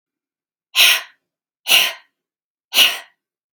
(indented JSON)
{
  "exhalation_length": "3.5 s",
  "exhalation_amplitude": 32768,
  "exhalation_signal_mean_std_ratio": 0.35,
  "survey_phase": "beta (2021-08-13 to 2022-03-07)",
  "age": "45-64",
  "gender": "Female",
  "wearing_mask": "No",
  "symptom_none": true,
  "smoker_status": "Never smoked",
  "respiratory_condition_asthma": false,
  "respiratory_condition_other": false,
  "recruitment_source": "REACT",
  "submission_delay": "1 day",
  "covid_test_result": "Negative",
  "covid_test_method": "RT-qPCR",
  "influenza_a_test_result": "Negative",
  "influenza_b_test_result": "Negative"
}